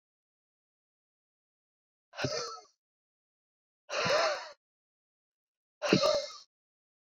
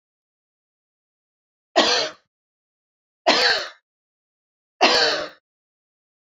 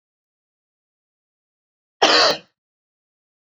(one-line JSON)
{"exhalation_length": "7.2 s", "exhalation_amplitude": 12609, "exhalation_signal_mean_std_ratio": 0.32, "three_cough_length": "6.4 s", "three_cough_amplitude": 27128, "three_cough_signal_mean_std_ratio": 0.33, "cough_length": "3.4 s", "cough_amplitude": 26579, "cough_signal_mean_std_ratio": 0.25, "survey_phase": "beta (2021-08-13 to 2022-03-07)", "age": "45-64", "gender": "Female", "wearing_mask": "No", "symptom_none": true, "symptom_onset": "12 days", "smoker_status": "Never smoked", "respiratory_condition_asthma": true, "respiratory_condition_other": false, "recruitment_source": "REACT", "submission_delay": "0 days", "covid_test_result": "Negative", "covid_test_method": "RT-qPCR"}